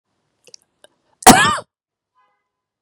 {"cough_length": "2.8 s", "cough_amplitude": 32768, "cough_signal_mean_std_ratio": 0.24, "survey_phase": "beta (2021-08-13 to 2022-03-07)", "age": "45-64", "gender": "Female", "wearing_mask": "No", "symptom_cough_any": true, "symptom_runny_or_blocked_nose": true, "symptom_sore_throat": true, "symptom_fatigue": true, "symptom_onset": "3 days", "smoker_status": "Never smoked", "recruitment_source": "Test and Trace", "submission_delay": "1 day", "covid_test_result": "Positive", "covid_test_method": "RT-qPCR", "covid_ct_value": 23.3, "covid_ct_gene": "N gene"}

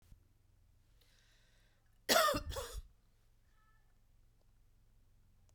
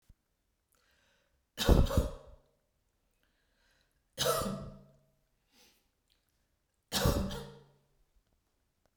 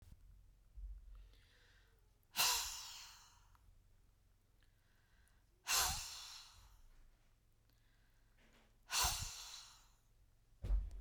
{"cough_length": "5.5 s", "cough_amplitude": 6750, "cough_signal_mean_std_ratio": 0.27, "three_cough_length": "9.0 s", "three_cough_amplitude": 9406, "three_cough_signal_mean_std_ratio": 0.29, "exhalation_length": "11.0 s", "exhalation_amplitude": 2920, "exhalation_signal_mean_std_ratio": 0.39, "survey_phase": "beta (2021-08-13 to 2022-03-07)", "age": "65+", "gender": "Female", "wearing_mask": "No", "symptom_none": true, "smoker_status": "Never smoked", "respiratory_condition_asthma": false, "respiratory_condition_other": false, "recruitment_source": "REACT", "submission_delay": "2 days", "covid_test_result": "Negative", "covid_test_method": "RT-qPCR"}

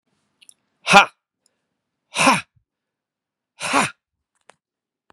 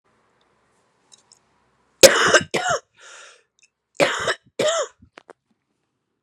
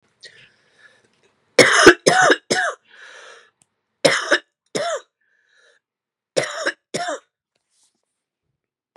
{"exhalation_length": "5.1 s", "exhalation_amplitude": 32768, "exhalation_signal_mean_std_ratio": 0.24, "cough_length": "6.2 s", "cough_amplitude": 32768, "cough_signal_mean_std_ratio": 0.29, "three_cough_length": "9.0 s", "three_cough_amplitude": 32768, "three_cough_signal_mean_std_ratio": 0.31, "survey_phase": "beta (2021-08-13 to 2022-03-07)", "age": "45-64", "gender": "Male", "wearing_mask": "No", "symptom_new_continuous_cough": true, "symptom_shortness_of_breath": true, "symptom_sore_throat": true, "symptom_fatigue": true, "symptom_fever_high_temperature": true, "symptom_onset": "3 days", "smoker_status": "Never smoked", "respiratory_condition_asthma": false, "respiratory_condition_other": false, "recruitment_source": "Test and Trace", "submission_delay": "1 day", "covid_test_result": "Positive", "covid_test_method": "RT-qPCR", "covid_ct_value": 16.0, "covid_ct_gene": "ORF1ab gene", "covid_ct_mean": 16.3, "covid_viral_load": "4400000 copies/ml", "covid_viral_load_category": "High viral load (>1M copies/ml)"}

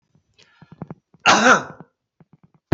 {"cough_length": "2.7 s", "cough_amplitude": 29808, "cough_signal_mean_std_ratio": 0.3, "survey_phase": "beta (2021-08-13 to 2022-03-07)", "age": "65+", "gender": "Male", "wearing_mask": "No", "symptom_none": true, "smoker_status": "Never smoked", "respiratory_condition_asthma": false, "respiratory_condition_other": false, "recruitment_source": "REACT", "submission_delay": "1 day", "covid_test_result": "Negative", "covid_test_method": "RT-qPCR"}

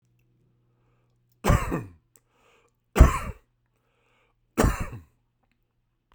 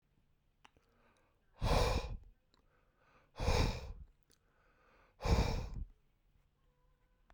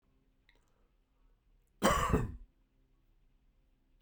{"three_cough_length": "6.1 s", "three_cough_amplitude": 32767, "three_cough_signal_mean_std_ratio": 0.24, "exhalation_length": "7.3 s", "exhalation_amplitude": 3213, "exhalation_signal_mean_std_ratio": 0.38, "cough_length": "4.0 s", "cough_amplitude": 7441, "cough_signal_mean_std_ratio": 0.29, "survey_phase": "beta (2021-08-13 to 2022-03-07)", "age": "45-64", "gender": "Male", "wearing_mask": "No", "symptom_runny_or_blocked_nose": true, "symptom_other": true, "smoker_status": "Never smoked", "respiratory_condition_asthma": false, "respiratory_condition_other": false, "recruitment_source": "Test and Trace", "submission_delay": "0 days", "covid_test_result": "Negative", "covid_test_method": "LFT"}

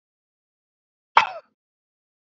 {"cough_length": "2.2 s", "cough_amplitude": 26587, "cough_signal_mean_std_ratio": 0.15, "survey_phase": "alpha (2021-03-01 to 2021-08-12)", "age": "18-44", "gender": "Male", "wearing_mask": "No", "symptom_abdominal_pain": true, "symptom_fatigue": true, "symptom_fever_high_temperature": true, "symptom_headache": true, "smoker_status": "Never smoked", "respiratory_condition_asthma": false, "respiratory_condition_other": false, "recruitment_source": "Test and Trace", "submission_delay": "2 days", "covid_test_result": "Positive", "covid_test_method": "RT-qPCR", "covid_ct_value": 15.5, "covid_ct_gene": "ORF1ab gene", "covid_ct_mean": 16.2, "covid_viral_load": "5000000 copies/ml", "covid_viral_load_category": "High viral load (>1M copies/ml)"}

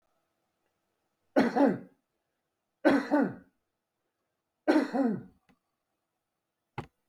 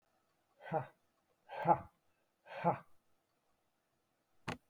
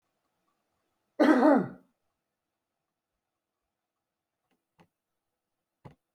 {"three_cough_length": "7.1 s", "three_cough_amplitude": 11190, "three_cough_signal_mean_std_ratio": 0.33, "exhalation_length": "4.7 s", "exhalation_amplitude": 4523, "exhalation_signal_mean_std_ratio": 0.26, "cough_length": "6.1 s", "cough_amplitude": 12339, "cough_signal_mean_std_ratio": 0.22, "survey_phase": "beta (2021-08-13 to 2022-03-07)", "age": "65+", "gender": "Male", "wearing_mask": "No", "symptom_none": true, "smoker_status": "Ex-smoker", "respiratory_condition_asthma": false, "respiratory_condition_other": false, "recruitment_source": "REACT", "submission_delay": "1 day", "covid_test_result": "Negative", "covid_test_method": "RT-qPCR", "influenza_a_test_result": "Negative", "influenza_b_test_result": "Negative"}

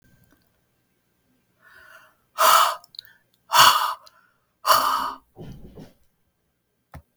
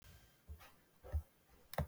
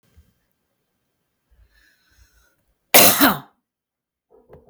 {"exhalation_length": "7.2 s", "exhalation_amplitude": 32766, "exhalation_signal_mean_std_ratio": 0.32, "three_cough_length": "1.9 s", "three_cough_amplitude": 1795, "three_cough_signal_mean_std_ratio": 0.37, "cough_length": "4.7 s", "cough_amplitude": 32768, "cough_signal_mean_std_ratio": 0.23, "survey_phase": "beta (2021-08-13 to 2022-03-07)", "age": "45-64", "gender": "Female", "wearing_mask": "No", "symptom_none": true, "smoker_status": "Ex-smoker", "respiratory_condition_asthma": false, "respiratory_condition_other": false, "recruitment_source": "REACT", "submission_delay": "0 days", "covid_test_result": "Negative", "covid_test_method": "RT-qPCR"}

